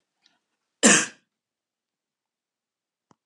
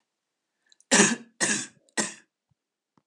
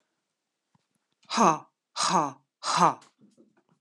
{
  "cough_length": "3.3 s",
  "cough_amplitude": 28233,
  "cough_signal_mean_std_ratio": 0.2,
  "three_cough_length": "3.1 s",
  "three_cough_amplitude": 18148,
  "three_cough_signal_mean_std_ratio": 0.32,
  "exhalation_length": "3.8 s",
  "exhalation_amplitude": 16846,
  "exhalation_signal_mean_std_ratio": 0.34,
  "survey_phase": "beta (2021-08-13 to 2022-03-07)",
  "age": "45-64",
  "gender": "Female",
  "wearing_mask": "No",
  "symptom_none": true,
  "smoker_status": "Never smoked",
  "respiratory_condition_asthma": false,
  "respiratory_condition_other": false,
  "recruitment_source": "Test and Trace",
  "submission_delay": "1 day",
  "covid_test_result": "Negative",
  "covid_test_method": "RT-qPCR"
}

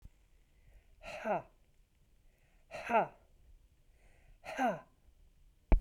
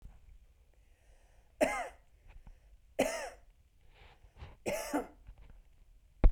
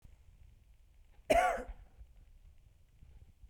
{
  "exhalation_length": "5.8 s",
  "exhalation_amplitude": 7082,
  "exhalation_signal_mean_std_ratio": 0.28,
  "three_cough_length": "6.3 s",
  "three_cough_amplitude": 9727,
  "three_cough_signal_mean_std_ratio": 0.28,
  "cough_length": "3.5 s",
  "cough_amplitude": 6368,
  "cough_signal_mean_std_ratio": 0.31,
  "survey_phase": "beta (2021-08-13 to 2022-03-07)",
  "age": "45-64",
  "gender": "Female",
  "wearing_mask": "No",
  "symptom_none": true,
  "smoker_status": "Never smoked",
  "respiratory_condition_asthma": false,
  "respiratory_condition_other": false,
  "recruitment_source": "REACT",
  "submission_delay": "3 days",
  "covid_test_result": "Negative",
  "covid_test_method": "RT-qPCR",
  "influenza_a_test_result": "Negative",
  "influenza_b_test_result": "Negative"
}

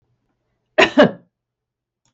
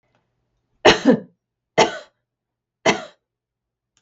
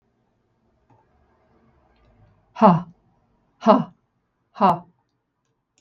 {
  "cough_length": "2.1 s",
  "cough_amplitude": 32768,
  "cough_signal_mean_std_ratio": 0.26,
  "three_cough_length": "4.0 s",
  "three_cough_amplitude": 32768,
  "three_cough_signal_mean_std_ratio": 0.27,
  "exhalation_length": "5.8 s",
  "exhalation_amplitude": 32768,
  "exhalation_signal_mean_std_ratio": 0.24,
  "survey_phase": "beta (2021-08-13 to 2022-03-07)",
  "age": "45-64",
  "gender": "Female",
  "wearing_mask": "No",
  "symptom_none": true,
  "smoker_status": "Ex-smoker",
  "respiratory_condition_asthma": false,
  "respiratory_condition_other": false,
  "recruitment_source": "Test and Trace",
  "submission_delay": "0 days",
  "covid_test_result": "Negative",
  "covid_test_method": "RT-qPCR"
}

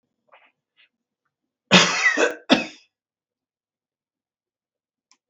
{
  "cough_length": "5.3 s",
  "cough_amplitude": 32768,
  "cough_signal_mean_std_ratio": 0.27,
  "survey_phase": "beta (2021-08-13 to 2022-03-07)",
  "age": "65+",
  "gender": "Male",
  "wearing_mask": "No",
  "symptom_none": true,
  "smoker_status": "Never smoked",
  "respiratory_condition_asthma": false,
  "respiratory_condition_other": false,
  "recruitment_source": "REACT",
  "submission_delay": "3 days",
  "covid_test_result": "Negative",
  "covid_test_method": "RT-qPCR",
  "influenza_a_test_result": "Negative",
  "influenza_b_test_result": "Negative"
}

